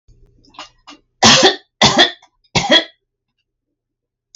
{"three_cough_length": "4.4 s", "three_cough_amplitude": 32768, "three_cough_signal_mean_std_ratio": 0.36, "survey_phase": "alpha (2021-03-01 to 2021-08-12)", "age": "65+", "gender": "Female", "wearing_mask": "No", "symptom_none": true, "smoker_status": "Ex-smoker", "respiratory_condition_asthma": false, "respiratory_condition_other": false, "recruitment_source": "REACT", "submission_delay": "3 days", "covid_test_result": "Negative", "covid_test_method": "RT-qPCR"}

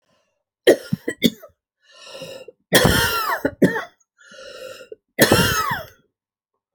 {"three_cough_length": "6.7 s", "three_cough_amplitude": 32768, "three_cough_signal_mean_std_ratio": 0.41, "survey_phase": "alpha (2021-03-01 to 2021-08-12)", "age": "65+", "gender": "Female", "wearing_mask": "No", "symptom_fatigue": true, "symptom_onset": "12 days", "smoker_status": "Never smoked", "respiratory_condition_asthma": false, "respiratory_condition_other": false, "recruitment_source": "REACT", "submission_delay": "2 days", "covid_test_result": "Negative", "covid_test_method": "RT-qPCR"}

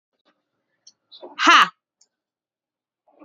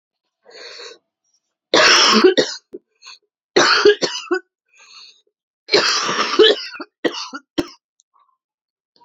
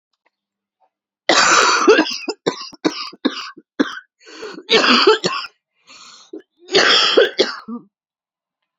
{"exhalation_length": "3.2 s", "exhalation_amplitude": 31378, "exhalation_signal_mean_std_ratio": 0.22, "three_cough_length": "9.0 s", "three_cough_amplitude": 32768, "three_cough_signal_mean_std_ratio": 0.41, "cough_length": "8.8 s", "cough_amplitude": 32176, "cough_signal_mean_std_ratio": 0.46, "survey_phase": "beta (2021-08-13 to 2022-03-07)", "age": "18-44", "gender": "Female", "wearing_mask": "No", "symptom_cough_any": true, "symptom_runny_or_blocked_nose": true, "symptom_shortness_of_breath": true, "symptom_sore_throat": true, "symptom_fatigue": true, "symptom_change_to_sense_of_smell_or_taste": true, "symptom_loss_of_taste": true, "symptom_onset": "5 days", "smoker_status": "Never smoked", "respiratory_condition_asthma": false, "respiratory_condition_other": false, "recruitment_source": "Test and Trace", "submission_delay": "2 days", "covid_test_result": "Positive", "covid_test_method": "RT-qPCR", "covid_ct_value": 16.6, "covid_ct_gene": "ORF1ab gene", "covid_ct_mean": 17.8, "covid_viral_load": "1500000 copies/ml", "covid_viral_load_category": "High viral load (>1M copies/ml)"}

